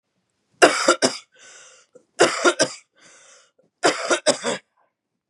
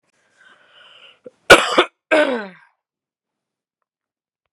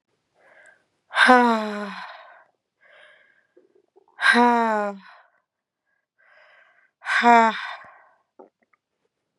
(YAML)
three_cough_length: 5.3 s
three_cough_amplitude: 32123
three_cough_signal_mean_std_ratio: 0.37
cough_length: 4.5 s
cough_amplitude: 32768
cough_signal_mean_std_ratio: 0.25
exhalation_length: 9.4 s
exhalation_amplitude: 32041
exhalation_signal_mean_std_ratio: 0.33
survey_phase: beta (2021-08-13 to 2022-03-07)
age: 18-44
gender: Female
wearing_mask: 'No'
symptom_cough_any: true
symptom_runny_or_blocked_nose: true
symptom_sore_throat: true
symptom_diarrhoea: true
symptom_fatigue: true
symptom_onset: 12 days
smoker_status: Never smoked
respiratory_condition_asthma: false
respiratory_condition_other: false
recruitment_source: REACT
submission_delay: 1 day
covid_test_result: Negative
covid_test_method: RT-qPCR
influenza_a_test_result: Unknown/Void
influenza_b_test_result: Unknown/Void